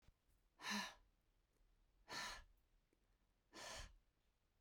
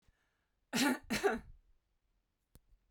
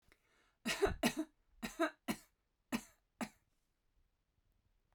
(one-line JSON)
{"exhalation_length": "4.6 s", "exhalation_amplitude": 675, "exhalation_signal_mean_std_ratio": 0.41, "cough_length": "2.9 s", "cough_amplitude": 3327, "cough_signal_mean_std_ratio": 0.36, "three_cough_length": "4.9 s", "three_cough_amplitude": 3391, "three_cough_signal_mean_std_ratio": 0.32, "survey_phase": "beta (2021-08-13 to 2022-03-07)", "age": "45-64", "gender": "Female", "wearing_mask": "No", "symptom_none": true, "smoker_status": "Never smoked", "respiratory_condition_asthma": false, "respiratory_condition_other": false, "recruitment_source": "REACT", "submission_delay": "2 days", "covid_test_result": "Negative", "covid_test_method": "RT-qPCR"}